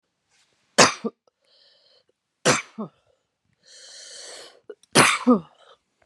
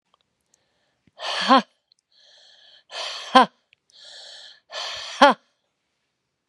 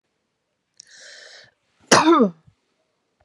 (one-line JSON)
{"three_cough_length": "6.1 s", "three_cough_amplitude": 32767, "three_cough_signal_mean_std_ratio": 0.28, "exhalation_length": "6.5 s", "exhalation_amplitude": 32767, "exhalation_signal_mean_std_ratio": 0.25, "cough_length": "3.2 s", "cough_amplitude": 32767, "cough_signal_mean_std_ratio": 0.29, "survey_phase": "beta (2021-08-13 to 2022-03-07)", "age": "45-64", "gender": "Female", "wearing_mask": "No", "symptom_cough_any": true, "symptom_runny_or_blocked_nose": true, "symptom_fatigue": true, "symptom_headache": true, "symptom_change_to_sense_of_smell_or_taste": true, "smoker_status": "Ex-smoker", "respiratory_condition_asthma": false, "respiratory_condition_other": false, "recruitment_source": "Test and Trace", "submission_delay": "3 days", "covid_test_result": "Positive", "covid_test_method": "RT-qPCR"}